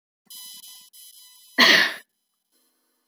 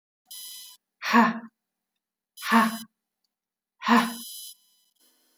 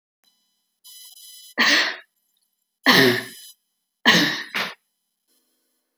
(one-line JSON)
{"cough_length": "3.1 s", "cough_amplitude": 26303, "cough_signal_mean_std_ratio": 0.29, "exhalation_length": "5.4 s", "exhalation_amplitude": 18524, "exhalation_signal_mean_std_ratio": 0.33, "three_cough_length": "6.0 s", "three_cough_amplitude": 28650, "three_cough_signal_mean_std_ratio": 0.36, "survey_phase": "beta (2021-08-13 to 2022-03-07)", "age": "45-64", "gender": "Female", "wearing_mask": "No", "symptom_none": true, "smoker_status": "Ex-smoker", "respiratory_condition_asthma": false, "respiratory_condition_other": false, "recruitment_source": "REACT", "submission_delay": "4 days", "covid_test_result": "Negative", "covid_test_method": "RT-qPCR", "influenza_a_test_result": "Unknown/Void", "influenza_b_test_result": "Unknown/Void"}